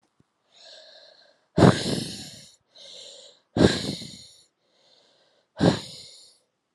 {
  "exhalation_length": "6.7 s",
  "exhalation_amplitude": 29219,
  "exhalation_signal_mean_std_ratio": 0.29,
  "survey_phase": "alpha (2021-03-01 to 2021-08-12)",
  "age": "18-44",
  "gender": "Female",
  "wearing_mask": "No",
  "symptom_cough_any": true,
  "symptom_shortness_of_breath": true,
  "symptom_diarrhoea": true,
  "symptom_fatigue": true,
  "symptom_onset": "7 days",
  "smoker_status": "Never smoked",
  "respiratory_condition_asthma": false,
  "respiratory_condition_other": false,
  "recruitment_source": "Test and Trace",
  "submission_delay": "1 day",
  "covid_test_result": "Positive",
  "covid_test_method": "RT-qPCR",
  "covid_ct_value": 24.0,
  "covid_ct_gene": "ORF1ab gene",
  "covid_ct_mean": 24.5,
  "covid_viral_load": "9200 copies/ml",
  "covid_viral_load_category": "Minimal viral load (< 10K copies/ml)"
}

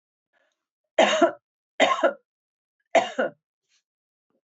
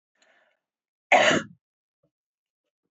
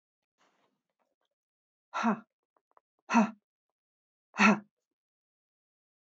{
  "three_cough_length": "4.4 s",
  "three_cough_amplitude": 17577,
  "three_cough_signal_mean_std_ratio": 0.33,
  "cough_length": "2.9 s",
  "cough_amplitude": 18668,
  "cough_signal_mean_std_ratio": 0.25,
  "exhalation_length": "6.1 s",
  "exhalation_amplitude": 11095,
  "exhalation_signal_mean_std_ratio": 0.24,
  "survey_phase": "beta (2021-08-13 to 2022-03-07)",
  "age": "65+",
  "gender": "Female",
  "wearing_mask": "No",
  "symptom_cough_any": true,
  "smoker_status": "Never smoked",
  "respiratory_condition_asthma": false,
  "respiratory_condition_other": false,
  "recruitment_source": "Test and Trace",
  "submission_delay": "1 day",
  "covid_test_result": "Positive",
  "covid_test_method": "RT-qPCR",
  "covid_ct_value": 34.7,
  "covid_ct_gene": "ORF1ab gene"
}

